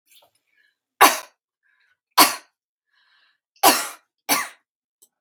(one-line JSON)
{"three_cough_length": "5.2 s", "three_cough_amplitude": 32768, "three_cough_signal_mean_std_ratio": 0.26, "survey_phase": "beta (2021-08-13 to 2022-03-07)", "age": "45-64", "gender": "Female", "wearing_mask": "No", "symptom_cough_any": true, "symptom_runny_or_blocked_nose": true, "symptom_fatigue": true, "smoker_status": "Never smoked", "respiratory_condition_asthma": false, "respiratory_condition_other": false, "recruitment_source": "REACT", "submission_delay": "0 days", "covid_test_result": "Negative", "covid_test_method": "RT-qPCR"}